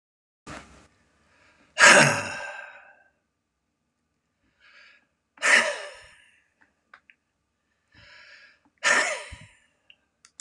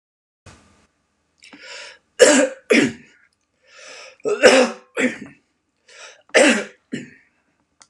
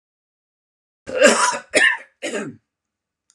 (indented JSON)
{
  "exhalation_length": "10.4 s",
  "exhalation_amplitude": 27515,
  "exhalation_signal_mean_std_ratio": 0.26,
  "three_cough_length": "7.9 s",
  "three_cough_amplitude": 32768,
  "three_cough_signal_mean_std_ratio": 0.34,
  "cough_length": "3.3 s",
  "cough_amplitude": 32441,
  "cough_signal_mean_std_ratio": 0.39,
  "survey_phase": "beta (2021-08-13 to 2022-03-07)",
  "age": "45-64",
  "gender": "Male",
  "wearing_mask": "No",
  "symptom_none": true,
  "smoker_status": "Never smoked",
  "respiratory_condition_asthma": false,
  "respiratory_condition_other": false,
  "recruitment_source": "REACT",
  "submission_delay": "1 day",
  "covid_test_result": "Negative",
  "covid_test_method": "RT-qPCR",
  "influenza_a_test_result": "Negative",
  "influenza_b_test_result": "Negative"
}